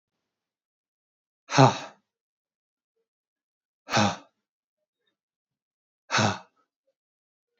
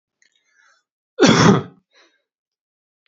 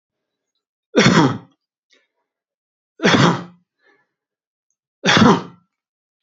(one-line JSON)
{"exhalation_length": "7.6 s", "exhalation_amplitude": 23440, "exhalation_signal_mean_std_ratio": 0.22, "cough_length": "3.1 s", "cough_amplitude": 30662, "cough_signal_mean_std_ratio": 0.3, "three_cough_length": "6.2 s", "three_cough_amplitude": 30349, "three_cough_signal_mean_std_ratio": 0.35, "survey_phase": "beta (2021-08-13 to 2022-03-07)", "age": "45-64", "gender": "Male", "wearing_mask": "No", "symptom_none": true, "smoker_status": "Ex-smoker", "respiratory_condition_asthma": false, "respiratory_condition_other": false, "recruitment_source": "REACT", "submission_delay": "1 day", "covid_test_result": "Negative", "covid_test_method": "RT-qPCR"}